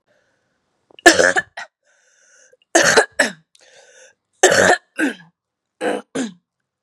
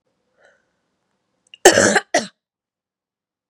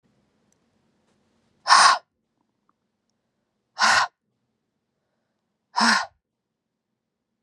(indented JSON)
{
  "three_cough_length": "6.8 s",
  "three_cough_amplitude": 32768,
  "three_cough_signal_mean_std_ratio": 0.35,
  "cough_length": "3.5 s",
  "cough_amplitude": 32768,
  "cough_signal_mean_std_ratio": 0.25,
  "exhalation_length": "7.4 s",
  "exhalation_amplitude": 26332,
  "exhalation_signal_mean_std_ratio": 0.26,
  "survey_phase": "beta (2021-08-13 to 2022-03-07)",
  "age": "18-44",
  "gender": "Female",
  "wearing_mask": "No",
  "symptom_cough_any": true,
  "symptom_runny_or_blocked_nose": true,
  "symptom_sore_throat": true,
  "symptom_fatigue": true,
  "symptom_change_to_sense_of_smell_or_taste": true,
  "symptom_onset": "4 days",
  "smoker_status": "Never smoked",
  "respiratory_condition_asthma": false,
  "respiratory_condition_other": false,
  "recruitment_source": "Test and Trace",
  "submission_delay": "1 day",
  "covid_test_result": "Positive",
  "covid_test_method": "RT-qPCR"
}